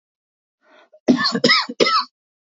{"cough_length": "2.6 s", "cough_amplitude": 26822, "cough_signal_mean_std_ratio": 0.44, "survey_phase": "alpha (2021-03-01 to 2021-08-12)", "age": "45-64", "gender": "Male", "wearing_mask": "No", "symptom_headache": true, "smoker_status": "Never smoked", "respiratory_condition_asthma": false, "respiratory_condition_other": false, "recruitment_source": "REACT", "submission_delay": "1 day", "covid_test_result": "Negative", "covid_test_method": "RT-qPCR"}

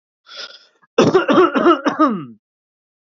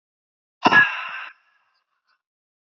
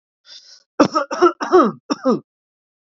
{"cough_length": "3.2 s", "cough_amplitude": 29374, "cough_signal_mean_std_ratio": 0.47, "exhalation_length": "2.6 s", "exhalation_amplitude": 27418, "exhalation_signal_mean_std_ratio": 0.28, "three_cough_length": "2.9 s", "three_cough_amplitude": 32767, "three_cough_signal_mean_std_ratio": 0.4, "survey_phase": "alpha (2021-03-01 to 2021-08-12)", "age": "18-44", "gender": "Male", "wearing_mask": "No", "symptom_none": true, "smoker_status": "Ex-smoker", "respiratory_condition_asthma": false, "respiratory_condition_other": false, "recruitment_source": "REACT", "submission_delay": "2 days", "covid_test_result": "Negative", "covid_test_method": "RT-qPCR"}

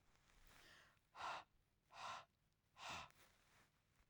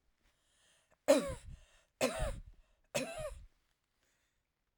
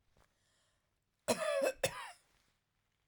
{"exhalation_length": "4.1 s", "exhalation_amplitude": 412, "exhalation_signal_mean_std_ratio": 0.47, "three_cough_length": "4.8 s", "three_cough_amplitude": 6742, "three_cough_signal_mean_std_ratio": 0.32, "cough_length": "3.1 s", "cough_amplitude": 3632, "cough_signal_mean_std_ratio": 0.36, "survey_phase": "alpha (2021-03-01 to 2021-08-12)", "age": "45-64", "gender": "Female", "wearing_mask": "No", "symptom_none": true, "smoker_status": "Ex-smoker", "respiratory_condition_asthma": false, "respiratory_condition_other": false, "recruitment_source": "REACT", "submission_delay": "1 day", "covid_test_result": "Negative", "covid_test_method": "RT-qPCR"}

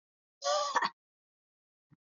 {"cough_length": "2.1 s", "cough_amplitude": 5615, "cough_signal_mean_std_ratio": 0.36, "survey_phase": "alpha (2021-03-01 to 2021-08-12)", "age": "45-64", "gender": "Female", "wearing_mask": "No", "symptom_none": true, "smoker_status": "Never smoked", "respiratory_condition_asthma": false, "respiratory_condition_other": false, "recruitment_source": "REACT", "submission_delay": "2 days", "covid_test_result": "Negative", "covid_test_method": "RT-qPCR"}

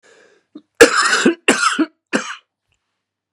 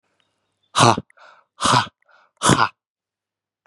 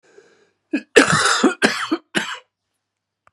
{"three_cough_length": "3.3 s", "three_cough_amplitude": 32768, "three_cough_signal_mean_std_ratio": 0.4, "exhalation_length": "3.7 s", "exhalation_amplitude": 32729, "exhalation_signal_mean_std_ratio": 0.33, "cough_length": "3.3 s", "cough_amplitude": 32768, "cough_signal_mean_std_ratio": 0.42, "survey_phase": "beta (2021-08-13 to 2022-03-07)", "age": "65+", "gender": "Male", "wearing_mask": "No", "symptom_new_continuous_cough": true, "symptom_runny_or_blocked_nose": true, "symptom_sore_throat": true, "symptom_fatigue": true, "symptom_onset": "4 days", "smoker_status": "Never smoked", "respiratory_condition_asthma": false, "respiratory_condition_other": false, "recruitment_source": "Test and Trace", "submission_delay": "2 days", "covid_test_result": "Positive", "covid_test_method": "RT-qPCR", "covid_ct_value": 22.1, "covid_ct_gene": "N gene"}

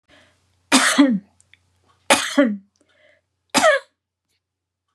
{"three_cough_length": "4.9 s", "three_cough_amplitude": 32614, "three_cough_signal_mean_std_ratio": 0.37, "survey_phase": "beta (2021-08-13 to 2022-03-07)", "age": "65+", "gender": "Female", "wearing_mask": "No", "symptom_none": true, "smoker_status": "Never smoked", "respiratory_condition_asthma": true, "respiratory_condition_other": false, "recruitment_source": "REACT", "submission_delay": "1 day", "covid_test_result": "Negative", "covid_test_method": "RT-qPCR", "influenza_a_test_result": "Unknown/Void", "influenza_b_test_result": "Unknown/Void"}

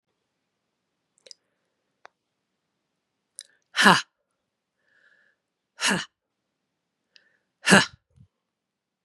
{"exhalation_length": "9.0 s", "exhalation_amplitude": 32749, "exhalation_signal_mean_std_ratio": 0.18, "survey_phase": "beta (2021-08-13 to 2022-03-07)", "age": "45-64", "gender": "Female", "wearing_mask": "No", "symptom_cough_any": true, "symptom_runny_or_blocked_nose": true, "symptom_shortness_of_breath": true, "symptom_sore_throat": true, "symptom_fatigue": true, "symptom_headache": true, "symptom_loss_of_taste": true, "symptom_onset": "4 days", "smoker_status": "Never smoked", "respiratory_condition_asthma": true, "respiratory_condition_other": false, "recruitment_source": "Test and Trace", "submission_delay": "1 day", "covid_test_result": "Positive", "covid_test_method": "ePCR"}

